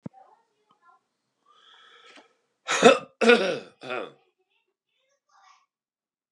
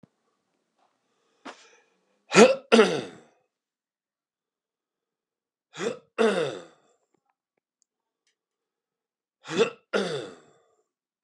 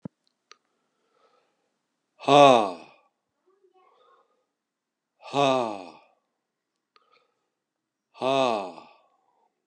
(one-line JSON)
{"cough_length": "6.3 s", "cough_amplitude": 31119, "cough_signal_mean_std_ratio": 0.24, "three_cough_length": "11.2 s", "three_cough_amplitude": 26115, "three_cough_signal_mean_std_ratio": 0.24, "exhalation_length": "9.7 s", "exhalation_amplitude": 24397, "exhalation_signal_mean_std_ratio": 0.24, "survey_phase": "beta (2021-08-13 to 2022-03-07)", "age": "65+", "gender": "Male", "wearing_mask": "No", "symptom_runny_or_blocked_nose": true, "symptom_headache": true, "smoker_status": "Never smoked", "respiratory_condition_asthma": false, "respiratory_condition_other": false, "recruitment_source": "Test and Trace", "submission_delay": "1 day", "covid_test_result": "Positive", "covid_test_method": "RT-qPCR", "covid_ct_value": 25.5, "covid_ct_gene": "ORF1ab gene", "covid_ct_mean": 26.0, "covid_viral_load": "2900 copies/ml", "covid_viral_load_category": "Minimal viral load (< 10K copies/ml)"}